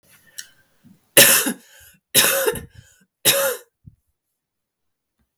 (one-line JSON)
{"three_cough_length": "5.4 s", "three_cough_amplitude": 32768, "three_cough_signal_mean_std_ratio": 0.34, "survey_phase": "beta (2021-08-13 to 2022-03-07)", "age": "18-44", "gender": "Female", "wearing_mask": "No", "symptom_cough_any": true, "symptom_runny_or_blocked_nose": true, "symptom_sore_throat": true, "symptom_fatigue": true, "symptom_change_to_sense_of_smell_or_taste": true, "smoker_status": "Never smoked", "respiratory_condition_asthma": false, "respiratory_condition_other": false, "recruitment_source": "Test and Trace", "submission_delay": "2 days", "covid_test_result": "Positive", "covid_test_method": "RT-qPCR"}